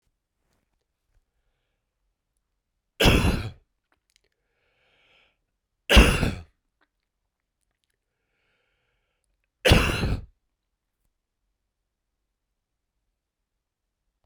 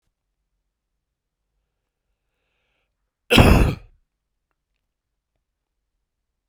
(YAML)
three_cough_length: 14.3 s
three_cough_amplitude: 27758
three_cough_signal_mean_std_ratio: 0.22
cough_length: 6.5 s
cough_amplitude: 32768
cough_signal_mean_std_ratio: 0.2
survey_phase: beta (2021-08-13 to 2022-03-07)
age: 45-64
gender: Male
wearing_mask: 'No'
symptom_cough_any: true
symptom_fatigue: true
symptom_headache: true
symptom_change_to_sense_of_smell_or_taste: true
smoker_status: Ex-smoker
respiratory_condition_asthma: false
respiratory_condition_other: false
recruitment_source: Test and Trace
submission_delay: 2 days
covid_test_result: Positive
covid_test_method: RT-qPCR